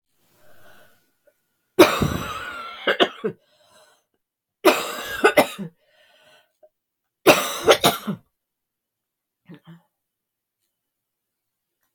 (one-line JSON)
{"three_cough_length": "11.9 s", "three_cough_amplitude": 32766, "three_cough_signal_mean_std_ratio": 0.29, "survey_phase": "beta (2021-08-13 to 2022-03-07)", "age": "45-64", "gender": "Female", "wearing_mask": "No", "symptom_cough_any": true, "symptom_new_continuous_cough": true, "symptom_runny_or_blocked_nose": true, "symptom_sore_throat": true, "symptom_fatigue": true, "symptom_fever_high_temperature": true, "symptom_headache": true, "symptom_change_to_sense_of_smell_or_taste": true, "symptom_onset": "5 days", "smoker_status": "Never smoked", "respiratory_condition_asthma": false, "respiratory_condition_other": false, "recruitment_source": "Test and Trace", "submission_delay": "2 days", "covid_test_result": "Positive", "covid_test_method": "ePCR"}